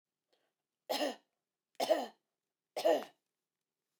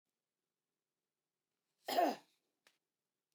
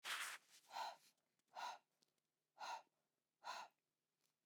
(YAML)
three_cough_length: 4.0 s
three_cough_amplitude: 4395
three_cough_signal_mean_std_ratio: 0.32
cough_length: 3.3 s
cough_amplitude: 2545
cough_signal_mean_std_ratio: 0.22
exhalation_length: 4.5 s
exhalation_amplitude: 604
exhalation_signal_mean_std_ratio: 0.45
survey_phase: beta (2021-08-13 to 2022-03-07)
age: 45-64
gender: Female
wearing_mask: 'No'
symptom_none: true
smoker_status: Never smoked
respiratory_condition_asthma: false
respiratory_condition_other: false
recruitment_source: REACT
submission_delay: 4 days
covid_test_result: Negative
covid_test_method: RT-qPCR